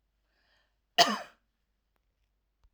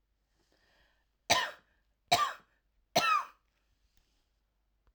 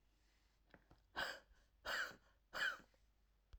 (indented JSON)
{
  "cough_length": "2.7 s",
  "cough_amplitude": 16034,
  "cough_signal_mean_std_ratio": 0.19,
  "three_cough_length": "4.9 s",
  "three_cough_amplitude": 8322,
  "three_cough_signal_mean_std_ratio": 0.29,
  "exhalation_length": "3.6 s",
  "exhalation_amplitude": 1082,
  "exhalation_signal_mean_std_ratio": 0.4,
  "survey_phase": "alpha (2021-03-01 to 2021-08-12)",
  "age": "45-64",
  "gender": "Female",
  "wearing_mask": "No",
  "symptom_none": true,
  "smoker_status": "Never smoked",
  "respiratory_condition_asthma": false,
  "respiratory_condition_other": false,
  "recruitment_source": "REACT",
  "submission_delay": "1 day",
  "covid_test_result": "Negative",
  "covid_test_method": "RT-qPCR"
}